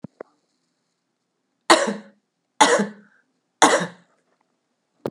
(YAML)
three_cough_length: 5.1 s
three_cough_amplitude: 32768
three_cough_signal_mean_std_ratio: 0.28
survey_phase: beta (2021-08-13 to 2022-03-07)
age: 18-44
gender: Female
wearing_mask: 'No'
symptom_cough_any: true
symptom_runny_or_blocked_nose: true
symptom_fatigue: true
symptom_headache: true
symptom_change_to_sense_of_smell_or_taste: true
symptom_loss_of_taste: true
symptom_onset: 3 days
smoker_status: Never smoked
respiratory_condition_asthma: false
respiratory_condition_other: false
recruitment_source: Test and Trace
submission_delay: 1 day
covid_test_result: Positive
covid_test_method: RT-qPCR
covid_ct_value: 20.0
covid_ct_gene: ORF1ab gene
covid_ct_mean: 20.9
covid_viral_load: 140000 copies/ml
covid_viral_load_category: Low viral load (10K-1M copies/ml)